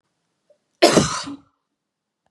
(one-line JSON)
{"cough_length": "2.3 s", "cough_amplitude": 31343, "cough_signal_mean_std_ratio": 0.3, "survey_phase": "beta (2021-08-13 to 2022-03-07)", "age": "18-44", "gender": "Female", "wearing_mask": "No", "symptom_none": true, "smoker_status": "Never smoked", "respiratory_condition_asthma": false, "respiratory_condition_other": false, "recruitment_source": "REACT", "submission_delay": "2 days", "covid_test_result": "Negative", "covid_test_method": "RT-qPCR", "influenza_a_test_result": "Negative", "influenza_b_test_result": "Negative"}